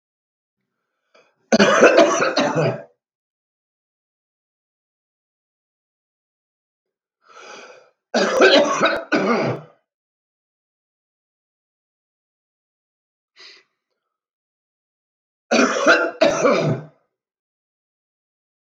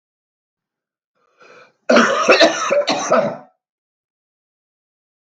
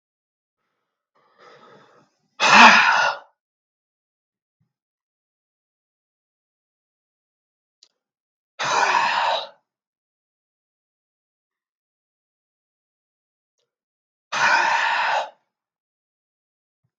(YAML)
three_cough_length: 18.7 s
three_cough_amplitude: 32768
three_cough_signal_mean_std_ratio: 0.35
cough_length: 5.4 s
cough_amplitude: 32768
cough_signal_mean_std_ratio: 0.39
exhalation_length: 17.0 s
exhalation_amplitude: 32768
exhalation_signal_mean_std_ratio: 0.27
survey_phase: beta (2021-08-13 to 2022-03-07)
age: 45-64
gender: Male
wearing_mask: 'No'
symptom_new_continuous_cough: true
symptom_sore_throat: true
symptom_headache: true
symptom_onset: 3 days
smoker_status: Never smoked
respiratory_condition_asthma: false
respiratory_condition_other: false
recruitment_source: Test and Trace
submission_delay: 2 days
covid_test_result: Positive
covid_test_method: RT-qPCR
covid_ct_value: 18.6
covid_ct_gene: ORF1ab gene
covid_ct_mean: 19.1
covid_viral_load: 540000 copies/ml
covid_viral_load_category: Low viral load (10K-1M copies/ml)